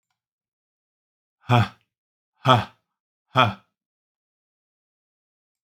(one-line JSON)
{"exhalation_length": "5.6 s", "exhalation_amplitude": 32768, "exhalation_signal_mean_std_ratio": 0.23, "survey_phase": "beta (2021-08-13 to 2022-03-07)", "age": "45-64", "gender": "Male", "wearing_mask": "No", "symptom_none": true, "smoker_status": "Never smoked", "respiratory_condition_asthma": false, "respiratory_condition_other": false, "recruitment_source": "REACT", "submission_delay": "2 days", "covid_test_result": "Negative", "covid_test_method": "RT-qPCR", "influenza_a_test_result": "Negative", "influenza_b_test_result": "Negative"}